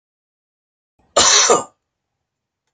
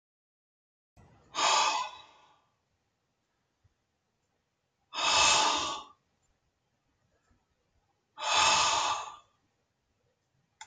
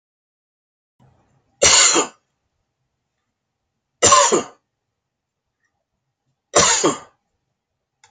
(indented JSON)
{
  "cough_length": "2.7 s",
  "cough_amplitude": 32221,
  "cough_signal_mean_std_ratio": 0.33,
  "exhalation_length": "10.7 s",
  "exhalation_amplitude": 8912,
  "exhalation_signal_mean_std_ratio": 0.37,
  "three_cough_length": "8.1 s",
  "three_cough_amplitude": 32767,
  "three_cough_signal_mean_std_ratio": 0.31,
  "survey_phase": "beta (2021-08-13 to 2022-03-07)",
  "age": "65+",
  "gender": "Male",
  "wearing_mask": "No",
  "symptom_none": true,
  "symptom_onset": "5 days",
  "smoker_status": "Ex-smoker",
  "respiratory_condition_asthma": false,
  "respiratory_condition_other": false,
  "recruitment_source": "REACT",
  "submission_delay": "1 day",
  "covid_test_result": "Negative",
  "covid_test_method": "RT-qPCR"
}